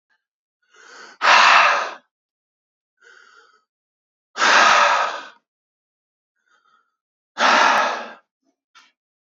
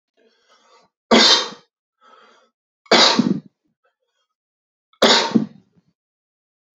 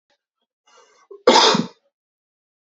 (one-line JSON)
{"exhalation_length": "9.2 s", "exhalation_amplitude": 28470, "exhalation_signal_mean_std_ratio": 0.39, "three_cough_length": "6.7 s", "three_cough_amplitude": 32767, "three_cough_signal_mean_std_ratio": 0.33, "cough_length": "2.7 s", "cough_amplitude": 29566, "cough_signal_mean_std_ratio": 0.29, "survey_phase": "beta (2021-08-13 to 2022-03-07)", "age": "18-44", "gender": "Male", "wearing_mask": "No", "symptom_change_to_sense_of_smell_or_taste": true, "symptom_loss_of_taste": true, "symptom_onset": "3 days", "smoker_status": "Never smoked", "respiratory_condition_asthma": false, "respiratory_condition_other": false, "recruitment_source": "Test and Trace", "submission_delay": "1 day", "covid_test_result": "Positive", "covid_test_method": "RT-qPCR", "covid_ct_value": 31.8, "covid_ct_gene": "N gene"}